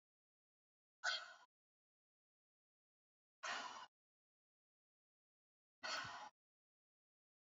{
  "exhalation_length": "7.6 s",
  "exhalation_amplitude": 1141,
  "exhalation_signal_mean_std_ratio": 0.28,
  "survey_phase": "beta (2021-08-13 to 2022-03-07)",
  "age": "45-64",
  "gender": "Female",
  "wearing_mask": "No",
  "symptom_cough_any": true,
  "symptom_other": true,
  "smoker_status": "Never smoked",
  "respiratory_condition_asthma": false,
  "respiratory_condition_other": false,
  "recruitment_source": "Test and Trace",
  "submission_delay": "2 days",
  "covid_test_result": "Positive",
  "covid_test_method": "RT-qPCR",
  "covid_ct_value": 27.7,
  "covid_ct_gene": "ORF1ab gene",
  "covid_ct_mean": 28.2,
  "covid_viral_load": "560 copies/ml",
  "covid_viral_load_category": "Minimal viral load (< 10K copies/ml)"
}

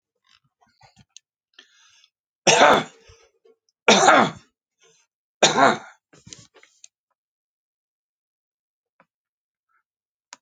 {
  "three_cough_length": "10.4 s",
  "three_cough_amplitude": 29012,
  "three_cough_signal_mean_std_ratio": 0.25,
  "survey_phase": "beta (2021-08-13 to 2022-03-07)",
  "age": "65+",
  "gender": "Male",
  "wearing_mask": "No",
  "symptom_cough_any": true,
  "symptom_shortness_of_breath": true,
  "smoker_status": "Ex-smoker",
  "respiratory_condition_asthma": false,
  "respiratory_condition_other": true,
  "recruitment_source": "REACT",
  "submission_delay": "0 days",
  "covid_test_result": "Negative",
  "covid_test_method": "RT-qPCR"
}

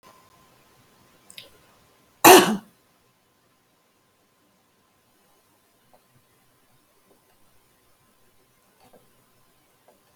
{
  "cough_length": "10.2 s",
  "cough_amplitude": 32767,
  "cough_signal_mean_std_ratio": 0.14,
  "survey_phase": "alpha (2021-03-01 to 2021-08-12)",
  "age": "65+",
  "gender": "Female",
  "wearing_mask": "No",
  "symptom_change_to_sense_of_smell_or_taste": true,
  "symptom_loss_of_taste": true,
  "symptom_onset": "12 days",
  "smoker_status": "Ex-smoker",
  "respiratory_condition_asthma": false,
  "respiratory_condition_other": false,
  "recruitment_source": "REACT",
  "submission_delay": "2 days",
  "covid_test_result": "Negative",
  "covid_test_method": "RT-qPCR"
}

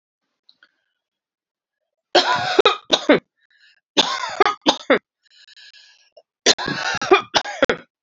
{
  "three_cough_length": "8.0 s",
  "three_cough_amplitude": 32768,
  "three_cough_signal_mean_std_ratio": 0.36,
  "survey_phase": "beta (2021-08-13 to 2022-03-07)",
  "age": "45-64",
  "gender": "Female",
  "wearing_mask": "No",
  "symptom_cough_any": true,
  "symptom_runny_or_blocked_nose": true,
  "symptom_shortness_of_breath": true,
  "symptom_sore_throat": true,
  "symptom_fatigue": true,
  "symptom_onset": "2 days",
  "smoker_status": "Never smoked",
  "respiratory_condition_asthma": false,
  "respiratory_condition_other": false,
  "recruitment_source": "Test and Trace",
  "submission_delay": "2 days",
  "covid_test_result": "Positive",
  "covid_test_method": "RT-qPCR",
  "covid_ct_value": 25.2,
  "covid_ct_gene": "ORF1ab gene",
  "covid_ct_mean": 25.7,
  "covid_viral_load": "3600 copies/ml",
  "covid_viral_load_category": "Minimal viral load (< 10K copies/ml)"
}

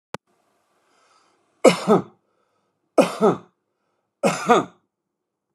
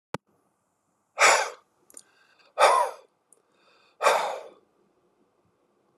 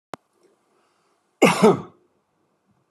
{
  "three_cough_length": "5.5 s",
  "three_cough_amplitude": 30623,
  "three_cough_signal_mean_std_ratio": 0.29,
  "exhalation_length": "6.0 s",
  "exhalation_amplitude": 20171,
  "exhalation_signal_mean_std_ratio": 0.31,
  "cough_length": "2.9 s",
  "cough_amplitude": 25470,
  "cough_signal_mean_std_ratio": 0.26,
  "survey_phase": "beta (2021-08-13 to 2022-03-07)",
  "age": "65+",
  "gender": "Male",
  "wearing_mask": "No",
  "symptom_none": true,
  "smoker_status": "Never smoked",
  "respiratory_condition_asthma": false,
  "respiratory_condition_other": false,
  "recruitment_source": "REACT",
  "submission_delay": "5 days",
  "covid_test_result": "Negative",
  "covid_test_method": "RT-qPCR"
}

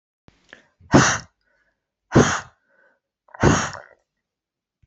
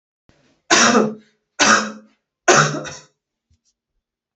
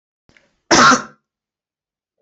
{
  "exhalation_length": "4.9 s",
  "exhalation_amplitude": 27963,
  "exhalation_signal_mean_std_ratio": 0.3,
  "three_cough_length": "4.4 s",
  "three_cough_amplitude": 30494,
  "three_cough_signal_mean_std_ratio": 0.39,
  "cough_length": "2.2 s",
  "cough_amplitude": 31118,
  "cough_signal_mean_std_ratio": 0.31,
  "survey_phase": "beta (2021-08-13 to 2022-03-07)",
  "age": "45-64",
  "gender": "Female",
  "wearing_mask": "No",
  "symptom_fatigue": true,
  "symptom_headache": true,
  "symptom_onset": "11 days",
  "smoker_status": "Never smoked",
  "respiratory_condition_asthma": false,
  "respiratory_condition_other": false,
  "recruitment_source": "REACT",
  "submission_delay": "12 days",
  "covid_test_result": "Negative",
  "covid_test_method": "RT-qPCR"
}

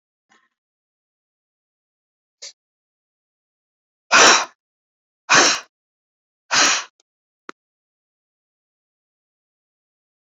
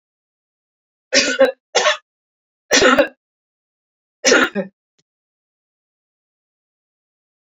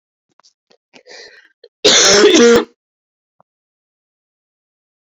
{
  "exhalation_length": "10.2 s",
  "exhalation_amplitude": 30748,
  "exhalation_signal_mean_std_ratio": 0.23,
  "three_cough_length": "7.4 s",
  "three_cough_amplitude": 31227,
  "three_cough_signal_mean_std_ratio": 0.31,
  "cough_length": "5.0 s",
  "cough_amplitude": 32187,
  "cough_signal_mean_std_ratio": 0.35,
  "survey_phase": "beta (2021-08-13 to 2022-03-07)",
  "age": "45-64",
  "gender": "Female",
  "wearing_mask": "No",
  "symptom_cough_any": true,
  "symptom_runny_or_blocked_nose": true,
  "symptom_sore_throat": true,
  "symptom_change_to_sense_of_smell_or_taste": true,
  "symptom_onset": "8 days",
  "smoker_status": "Never smoked",
  "respiratory_condition_asthma": false,
  "respiratory_condition_other": false,
  "recruitment_source": "Test and Trace",
  "submission_delay": "2 days",
  "covid_test_result": "Positive",
  "covid_test_method": "RT-qPCR",
  "covid_ct_value": 25.4,
  "covid_ct_gene": "N gene"
}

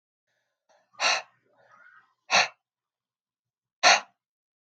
{
  "exhalation_length": "4.8 s",
  "exhalation_amplitude": 21987,
  "exhalation_signal_mean_std_ratio": 0.25,
  "survey_phase": "alpha (2021-03-01 to 2021-08-12)",
  "age": "18-44",
  "gender": "Female",
  "wearing_mask": "No",
  "symptom_cough_any": true,
  "symptom_diarrhoea": true,
  "symptom_fever_high_temperature": true,
  "symptom_loss_of_taste": true,
  "symptom_onset": "5 days",
  "smoker_status": "Never smoked",
  "respiratory_condition_asthma": false,
  "respiratory_condition_other": false,
  "recruitment_source": "Test and Trace",
  "submission_delay": "1 day",
  "covid_test_result": "Positive",
  "covid_test_method": "RT-qPCR",
  "covid_ct_value": 18.6,
  "covid_ct_gene": "ORF1ab gene"
}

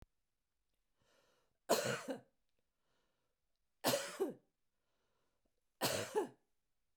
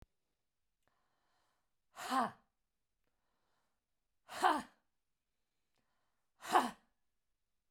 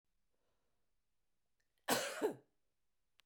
{
  "three_cough_length": "7.0 s",
  "three_cough_amplitude": 3927,
  "three_cough_signal_mean_std_ratio": 0.33,
  "exhalation_length": "7.7 s",
  "exhalation_amplitude": 5390,
  "exhalation_signal_mean_std_ratio": 0.23,
  "cough_length": "3.3 s",
  "cough_amplitude": 2948,
  "cough_signal_mean_std_ratio": 0.28,
  "survey_phase": "beta (2021-08-13 to 2022-03-07)",
  "age": "45-64",
  "gender": "Female",
  "wearing_mask": "No",
  "symptom_none": true,
  "smoker_status": "Ex-smoker",
  "respiratory_condition_asthma": false,
  "respiratory_condition_other": false,
  "recruitment_source": "REACT",
  "submission_delay": "1 day",
  "covid_test_result": "Negative",
  "covid_test_method": "RT-qPCR",
  "influenza_a_test_result": "Negative",
  "influenza_b_test_result": "Negative"
}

